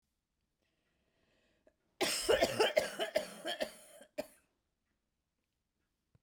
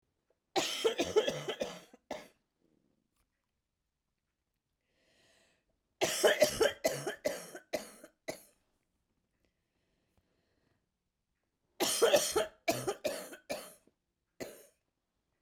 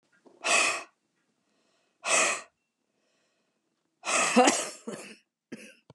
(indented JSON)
{
  "cough_length": "6.2 s",
  "cough_amplitude": 5899,
  "cough_signal_mean_std_ratio": 0.34,
  "three_cough_length": "15.4 s",
  "three_cough_amplitude": 7435,
  "three_cough_signal_mean_std_ratio": 0.34,
  "exhalation_length": "5.9 s",
  "exhalation_amplitude": 14458,
  "exhalation_signal_mean_std_ratio": 0.38,
  "survey_phase": "beta (2021-08-13 to 2022-03-07)",
  "age": "45-64",
  "gender": "Female",
  "wearing_mask": "No",
  "symptom_cough_any": true,
  "symptom_onset": "11 days",
  "smoker_status": "Never smoked",
  "respiratory_condition_asthma": false,
  "respiratory_condition_other": false,
  "recruitment_source": "REACT",
  "submission_delay": "2 days",
  "covid_test_result": "Negative",
  "covid_test_method": "RT-qPCR",
  "influenza_a_test_result": "Unknown/Void",
  "influenza_b_test_result": "Unknown/Void"
}